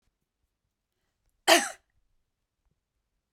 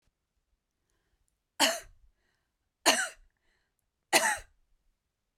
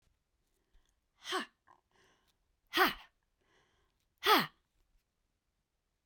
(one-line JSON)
{"cough_length": "3.3 s", "cough_amplitude": 23915, "cough_signal_mean_std_ratio": 0.17, "three_cough_length": "5.4 s", "three_cough_amplitude": 13735, "three_cough_signal_mean_std_ratio": 0.26, "exhalation_length": "6.1 s", "exhalation_amplitude": 6961, "exhalation_signal_mean_std_ratio": 0.23, "survey_phase": "beta (2021-08-13 to 2022-03-07)", "age": "45-64", "gender": "Female", "wearing_mask": "No", "symptom_fatigue": true, "symptom_headache": true, "symptom_onset": "5 days", "smoker_status": "Never smoked", "respiratory_condition_asthma": false, "respiratory_condition_other": false, "recruitment_source": "REACT", "submission_delay": "1 day", "covid_test_result": "Negative", "covid_test_method": "RT-qPCR"}